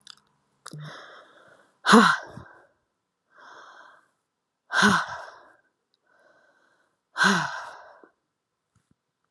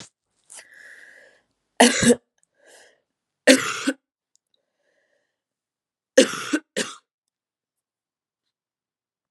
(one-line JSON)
{"exhalation_length": "9.3 s", "exhalation_amplitude": 26097, "exhalation_signal_mean_std_ratio": 0.27, "three_cough_length": "9.3 s", "three_cough_amplitude": 32768, "three_cough_signal_mean_std_ratio": 0.23, "survey_phase": "alpha (2021-03-01 to 2021-08-12)", "age": "18-44", "gender": "Female", "wearing_mask": "No", "symptom_cough_any": true, "symptom_shortness_of_breath": true, "symptom_fatigue": true, "symptom_fever_high_temperature": true, "symptom_headache": true, "symptom_change_to_sense_of_smell_or_taste": true, "smoker_status": "Ex-smoker", "respiratory_condition_asthma": false, "respiratory_condition_other": false, "recruitment_source": "Test and Trace", "submission_delay": "2 days", "covid_test_result": "Positive", "covid_test_method": "RT-qPCR", "covid_ct_value": 22.7, "covid_ct_gene": "ORF1ab gene", "covid_ct_mean": 23.1, "covid_viral_load": "27000 copies/ml", "covid_viral_load_category": "Low viral load (10K-1M copies/ml)"}